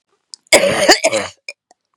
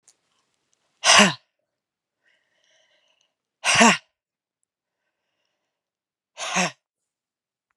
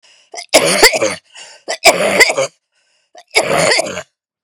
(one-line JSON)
{"cough_length": "2.0 s", "cough_amplitude": 32768, "cough_signal_mean_std_ratio": 0.45, "exhalation_length": "7.8 s", "exhalation_amplitude": 31644, "exhalation_signal_mean_std_ratio": 0.24, "three_cough_length": "4.4 s", "three_cough_amplitude": 32768, "three_cough_signal_mean_std_ratio": 0.51, "survey_phase": "beta (2021-08-13 to 2022-03-07)", "age": "45-64", "gender": "Female", "wearing_mask": "No", "symptom_cough_any": true, "symptom_runny_or_blocked_nose": true, "symptom_sore_throat": true, "symptom_fatigue": true, "symptom_fever_high_temperature": true, "symptom_headache": true, "symptom_onset": "3 days", "smoker_status": "Ex-smoker", "respiratory_condition_asthma": false, "respiratory_condition_other": false, "recruitment_source": "Test and Trace", "submission_delay": "2 days", "covid_test_result": "Positive", "covid_test_method": "RT-qPCR", "covid_ct_value": 30.2, "covid_ct_gene": "ORF1ab gene"}